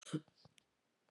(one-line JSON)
{"cough_length": "1.1 s", "cough_amplitude": 1313, "cough_signal_mean_std_ratio": 0.25, "survey_phase": "beta (2021-08-13 to 2022-03-07)", "age": "45-64", "gender": "Female", "wearing_mask": "No", "symptom_cough_any": true, "symptom_runny_or_blocked_nose": true, "symptom_sore_throat": true, "symptom_headache": true, "symptom_onset": "3 days", "smoker_status": "Ex-smoker", "respiratory_condition_asthma": false, "respiratory_condition_other": false, "recruitment_source": "Test and Trace", "submission_delay": "1 day", "covid_test_result": "Positive", "covid_test_method": "RT-qPCR", "covid_ct_value": 31.1, "covid_ct_gene": "ORF1ab gene"}